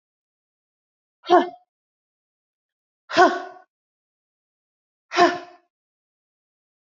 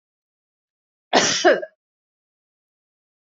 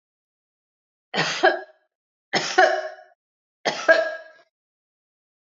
{
  "exhalation_length": "7.0 s",
  "exhalation_amplitude": 25739,
  "exhalation_signal_mean_std_ratio": 0.22,
  "cough_length": "3.3 s",
  "cough_amplitude": 26689,
  "cough_signal_mean_std_ratio": 0.27,
  "three_cough_length": "5.5 s",
  "three_cough_amplitude": 26972,
  "three_cough_signal_mean_std_ratio": 0.34,
  "survey_phase": "alpha (2021-03-01 to 2021-08-12)",
  "age": "45-64",
  "gender": "Female",
  "wearing_mask": "No",
  "symptom_none": true,
  "smoker_status": "Never smoked",
  "respiratory_condition_asthma": true,
  "respiratory_condition_other": false,
  "recruitment_source": "REACT",
  "submission_delay": "1 day",
  "covid_test_result": "Negative",
  "covid_test_method": "RT-qPCR"
}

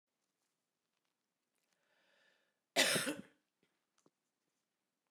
{
  "cough_length": "5.1 s",
  "cough_amplitude": 4684,
  "cough_signal_mean_std_ratio": 0.21,
  "survey_phase": "beta (2021-08-13 to 2022-03-07)",
  "age": "45-64",
  "gender": "Female",
  "wearing_mask": "No",
  "symptom_cough_any": true,
  "symptom_new_continuous_cough": true,
  "symptom_runny_or_blocked_nose": true,
  "symptom_fatigue": true,
  "symptom_change_to_sense_of_smell_or_taste": true,
  "symptom_loss_of_taste": true,
  "symptom_onset": "6 days",
  "smoker_status": "Never smoked",
  "respiratory_condition_asthma": false,
  "respiratory_condition_other": false,
  "recruitment_source": "Test and Trace",
  "submission_delay": "1 day",
  "covid_test_result": "Positive",
  "covid_test_method": "RT-qPCR"
}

